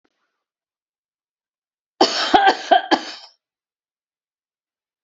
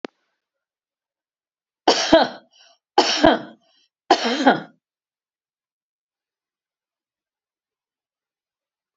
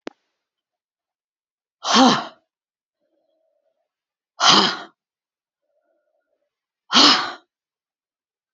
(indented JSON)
{
  "cough_length": "5.0 s",
  "cough_amplitude": 28904,
  "cough_signal_mean_std_ratio": 0.28,
  "three_cough_length": "9.0 s",
  "three_cough_amplitude": 29787,
  "three_cough_signal_mean_std_ratio": 0.26,
  "exhalation_length": "8.5 s",
  "exhalation_amplitude": 32404,
  "exhalation_signal_mean_std_ratio": 0.27,
  "survey_phase": "alpha (2021-03-01 to 2021-08-12)",
  "age": "65+",
  "gender": "Female",
  "wearing_mask": "No",
  "symptom_none": true,
  "smoker_status": "Ex-smoker",
  "respiratory_condition_asthma": false,
  "respiratory_condition_other": false,
  "recruitment_source": "REACT",
  "submission_delay": "1 day",
  "covid_test_result": "Negative",
  "covid_test_method": "RT-qPCR"
}